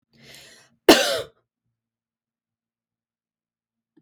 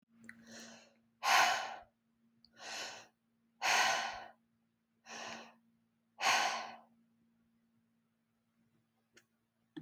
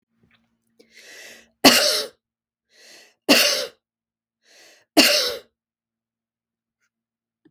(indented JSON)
{
  "cough_length": "4.0 s",
  "cough_amplitude": 32766,
  "cough_signal_mean_std_ratio": 0.19,
  "exhalation_length": "9.8 s",
  "exhalation_amplitude": 5040,
  "exhalation_signal_mean_std_ratio": 0.35,
  "three_cough_length": "7.5 s",
  "three_cough_amplitude": 32768,
  "three_cough_signal_mean_std_ratio": 0.29,
  "survey_phase": "beta (2021-08-13 to 2022-03-07)",
  "age": "45-64",
  "gender": "Female",
  "wearing_mask": "No",
  "symptom_sore_throat": true,
  "symptom_onset": "5 days",
  "smoker_status": "Ex-smoker",
  "respiratory_condition_asthma": false,
  "respiratory_condition_other": false,
  "recruitment_source": "REACT",
  "submission_delay": "1 day",
  "covid_test_result": "Negative",
  "covid_test_method": "RT-qPCR"
}